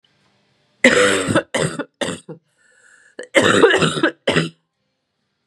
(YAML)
cough_length: 5.5 s
cough_amplitude: 32768
cough_signal_mean_std_ratio: 0.46
survey_phase: beta (2021-08-13 to 2022-03-07)
age: 18-44
gender: Female
wearing_mask: 'No'
symptom_cough_any: true
symptom_runny_or_blocked_nose: true
symptom_change_to_sense_of_smell_or_taste: true
symptom_loss_of_taste: true
symptom_onset: 7 days
smoker_status: Never smoked
respiratory_condition_asthma: false
respiratory_condition_other: false
recruitment_source: Test and Trace
submission_delay: 1 day
covid_test_result: Positive
covid_test_method: RT-qPCR